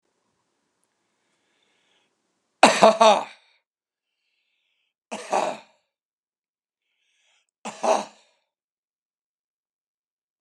three_cough_length: 10.4 s
three_cough_amplitude: 32767
three_cough_signal_mean_std_ratio: 0.21
survey_phase: beta (2021-08-13 to 2022-03-07)
age: 65+
gender: Male
wearing_mask: 'No'
symptom_shortness_of_breath: true
symptom_fatigue: true
symptom_headache: true
symptom_onset: 12 days
smoker_status: Ex-smoker
respiratory_condition_asthma: false
respiratory_condition_other: false
recruitment_source: REACT
submission_delay: 1 day
covid_test_result: Negative
covid_test_method: RT-qPCR
influenza_a_test_result: Negative
influenza_b_test_result: Negative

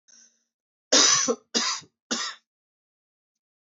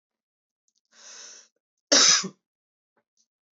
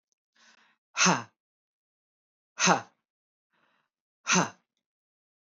three_cough_length: 3.7 s
three_cough_amplitude: 17475
three_cough_signal_mean_std_ratio: 0.36
cough_length: 3.6 s
cough_amplitude: 17190
cough_signal_mean_std_ratio: 0.25
exhalation_length: 5.5 s
exhalation_amplitude: 14428
exhalation_signal_mean_std_ratio: 0.25
survey_phase: beta (2021-08-13 to 2022-03-07)
age: 18-44
gender: Male
wearing_mask: 'No'
symptom_cough_any: true
symptom_sore_throat: true
symptom_onset: 3 days
smoker_status: Never smoked
respiratory_condition_asthma: false
respiratory_condition_other: false
recruitment_source: Test and Trace
submission_delay: 2 days
covid_test_result: Positive
covid_test_method: RT-qPCR
covid_ct_value: 20.8
covid_ct_gene: ORF1ab gene
covid_ct_mean: 21.3
covid_viral_load: 110000 copies/ml
covid_viral_load_category: Low viral load (10K-1M copies/ml)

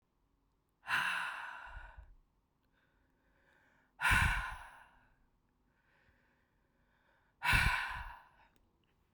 exhalation_length: 9.1 s
exhalation_amplitude: 5365
exhalation_signal_mean_std_ratio: 0.36
survey_phase: beta (2021-08-13 to 2022-03-07)
age: 18-44
gender: Female
wearing_mask: 'No'
symptom_cough_any: true
symptom_new_continuous_cough: true
symptom_runny_or_blocked_nose: true
symptom_shortness_of_breath: true
symptom_sore_throat: true
symptom_fatigue: true
symptom_headache: true
symptom_change_to_sense_of_smell_or_taste: true
symptom_onset: 3 days
smoker_status: Ex-smoker
respiratory_condition_asthma: false
respiratory_condition_other: false
recruitment_source: Test and Trace
submission_delay: 1 day
covid_test_result: Positive
covid_test_method: RT-qPCR
covid_ct_value: 23.4
covid_ct_gene: ORF1ab gene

